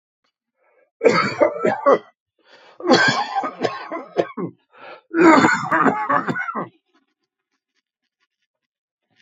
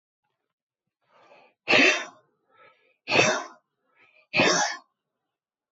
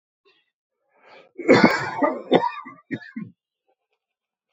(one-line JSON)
{"three_cough_length": "9.2 s", "three_cough_amplitude": 28183, "three_cough_signal_mean_std_ratio": 0.45, "exhalation_length": "5.7 s", "exhalation_amplitude": 19888, "exhalation_signal_mean_std_ratio": 0.34, "cough_length": "4.5 s", "cough_amplitude": 27532, "cough_signal_mean_std_ratio": 0.33, "survey_phase": "beta (2021-08-13 to 2022-03-07)", "age": "65+", "gender": "Male", "wearing_mask": "No", "symptom_runny_or_blocked_nose": true, "symptom_onset": "11 days", "smoker_status": "Never smoked", "respiratory_condition_asthma": false, "respiratory_condition_other": false, "recruitment_source": "REACT", "submission_delay": "2 days", "covid_test_result": "Negative", "covid_test_method": "RT-qPCR", "influenza_a_test_result": "Negative", "influenza_b_test_result": "Negative"}